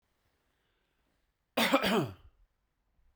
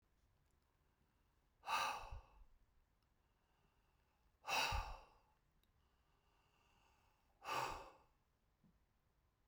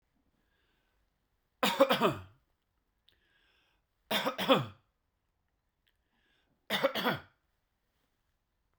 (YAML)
cough_length: 3.2 s
cough_amplitude: 7076
cough_signal_mean_std_ratio: 0.32
exhalation_length: 9.5 s
exhalation_amplitude: 1238
exhalation_signal_mean_std_ratio: 0.32
three_cough_length: 8.8 s
three_cough_amplitude: 10880
three_cough_signal_mean_std_ratio: 0.29
survey_phase: beta (2021-08-13 to 2022-03-07)
age: 45-64
gender: Male
wearing_mask: 'No'
symptom_none: true
smoker_status: Never smoked
respiratory_condition_asthma: false
respiratory_condition_other: false
recruitment_source: REACT
submission_delay: 2 days
covid_test_result: Negative
covid_test_method: RT-qPCR